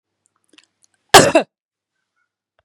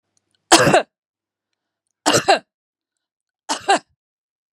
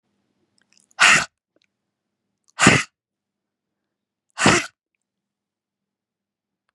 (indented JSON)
{
  "cough_length": "2.6 s",
  "cough_amplitude": 32768,
  "cough_signal_mean_std_ratio": 0.22,
  "three_cough_length": "4.5 s",
  "three_cough_amplitude": 32768,
  "three_cough_signal_mean_std_ratio": 0.3,
  "exhalation_length": "6.7 s",
  "exhalation_amplitude": 32482,
  "exhalation_signal_mean_std_ratio": 0.24,
  "survey_phase": "beta (2021-08-13 to 2022-03-07)",
  "age": "45-64",
  "gender": "Female",
  "wearing_mask": "No",
  "symptom_none": true,
  "smoker_status": "Never smoked",
  "respiratory_condition_asthma": false,
  "respiratory_condition_other": false,
  "recruitment_source": "REACT",
  "submission_delay": "2 days",
  "covid_test_result": "Negative",
  "covid_test_method": "RT-qPCR",
  "influenza_a_test_result": "Negative",
  "influenza_b_test_result": "Negative"
}